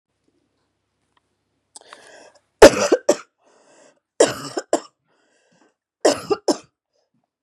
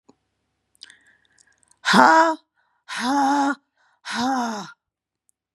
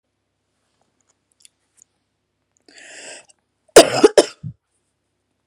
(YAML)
three_cough_length: 7.4 s
three_cough_amplitude: 32768
three_cough_signal_mean_std_ratio: 0.22
exhalation_length: 5.5 s
exhalation_amplitude: 32307
exhalation_signal_mean_std_ratio: 0.42
cough_length: 5.5 s
cough_amplitude: 32768
cough_signal_mean_std_ratio: 0.18
survey_phase: beta (2021-08-13 to 2022-03-07)
age: 45-64
gender: Female
wearing_mask: 'No'
symptom_cough_any: true
symptom_new_continuous_cough: true
symptom_fatigue: true
symptom_headache: true
symptom_onset: 6 days
smoker_status: Never smoked
respiratory_condition_asthma: false
respiratory_condition_other: false
recruitment_source: Test and Trace
submission_delay: 1 day
covid_test_result: Negative
covid_test_method: RT-qPCR